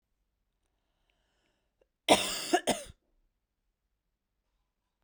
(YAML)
cough_length: 5.0 s
cough_amplitude: 15036
cough_signal_mean_std_ratio: 0.22
survey_phase: beta (2021-08-13 to 2022-03-07)
age: 18-44
gender: Female
wearing_mask: 'No'
symptom_runny_or_blocked_nose: true
symptom_headache: true
symptom_onset: 3 days
smoker_status: Never smoked
respiratory_condition_asthma: false
respiratory_condition_other: false
recruitment_source: Test and Trace
submission_delay: 2 days
covid_test_result: Positive
covid_test_method: RT-qPCR
covid_ct_value: 28.8
covid_ct_gene: N gene
covid_ct_mean: 28.9
covid_viral_load: 340 copies/ml
covid_viral_load_category: Minimal viral load (< 10K copies/ml)